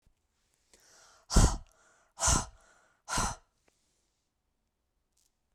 {"exhalation_length": "5.5 s", "exhalation_amplitude": 9976, "exhalation_signal_mean_std_ratio": 0.27, "survey_phase": "beta (2021-08-13 to 2022-03-07)", "age": "45-64", "gender": "Female", "wearing_mask": "No", "symptom_none": true, "smoker_status": "Never smoked", "respiratory_condition_asthma": false, "respiratory_condition_other": false, "recruitment_source": "REACT", "submission_delay": "0 days", "covid_test_result": "Negative", "covid_test_method": "RT-qPCR"}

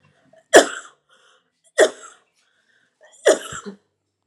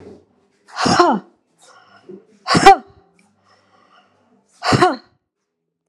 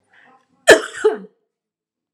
{"three_cough_length": "4.3 s", "three_cough_amplitude": 32768, "three_cough_signal_mean_std_ratio": 0.24, "exhalation_length": "5.9 s", "exhalation_amplitude": 32768, "exhalation_signal_mean_std_ratio": 0.31, "cough_length": "2.1 s", "cough_amplitude": 32768, "cough_signal_mean_std_ratio": 0.26, "survey_phase": "alpha (2021-03-01 to 2021-08-12)", "age": "45-64", "gender": "Female", "wearing_mask": "No", "symptom_fatigue": true, "symptom_fever_high_temperature": true, "symptom_headache": true, "symptom_change_to_sense_of_smell_or_taste": true, "symptom_loss_of_taste": true, "symptom_onset": "7 days", "smoker_status": "Ex-smoker", "respiratory_condition_asthma": false, "respiratory_condition_other": false, "recruitment_source": "Test and Trace", "submission_delay": "2 days", "covid_test_result": "Positive", "covid_test_method": "RT-qPCR", "covid_ct_value": 19.2, "covid_ct_gene": "ORF1ab gene", "covid_ct_mean": 19.2, "covid_viral_load": "500000 copies/ml", "covid_viral_load_category": "Low viral load (10K-1M copies/ml)"}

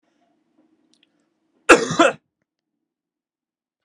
{"cough_length": "3.8 s", "cough_amplitude": 32768, "cough_signal_mean_std_ratio": 0.2, "survey_phase": "beta (2021-08-13 to 2022-03-07)", "age": "18-44", "gender": "Male", "wearing_mask": "No", "symptom_runny_or_blocked_nose": true, "symptom_onset": "4 days", "smoker_status": "Never smoked", "respiratory_condition_asthma": false, "respiratory_condition_other": false, "recruitment_source": "Test and Trace", "submission_delay": "2 days", "covid_test_result": "Positive", "covid_test_method": "RT-qPCR", "covid_ct_value": 16.6, "covid_ct_gene": "N gene", "covid_ct_mean": 17.5, "covid_viral_load": "1800000 copies/ml", "covid_viral_load_category": "High viral load (>1M copies/ml)"}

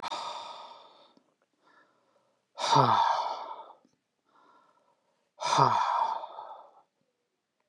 {"exhalation_length": "7.7 s", "exhalation_amplitude": 14631, "exhalation_signal_mean_std_ratio": 0.41, "survey_phase": "beta (2021-08-13 to 2022-03-07)", "age": "45-64", "gender": "Male", "wearing_mask": "No", "symptom_none": true, "symptom_onset": "3 days", "smoker_status": "Ex-smoker", "respiratory_condition_asthma": false, "respiratory_condition_other": false, "recruitment_source": "Test and Trace", "submission_delay": "1 day", "covid_test_result": "Negative", "covid_test_method": "RT-qPCR"}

